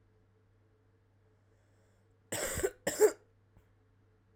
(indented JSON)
{
  "cough_length": "4.4 s",
  "cough_amplitude": 7680,
  "cough_signal_mean_std_ratio": 0.26,
  "survey_phase": "alpha (2021-03-01 to 2021-08-12)",
  "age": "18-44",
  "gender": "Female",
  "wearing_mask": "No",
  "symptom_cough_any": true,
  "symptom_shortness_of_breath": true,
  "symptom_fatigue": true,
  "symptom_headache": true,
  "symptom_change_to_sense_of_smell_or_taste": true,
  "symptom_onset": "3 days",
  "smoker_status": "Current smoker (1 to 10 cigarettes per day)",
  "respiratory_condition_asthma": false,
  "respiratory_condition_other": false,
  "recruitment_source": "Test and Trace",
  "submission_delay": "2 days",
  "covid_test_result": "Positive",
  "covid_test_method": "RT-qPCR",
  "covid_ct_value": 25.5,
  "covid_ct_gene": "N gene"
}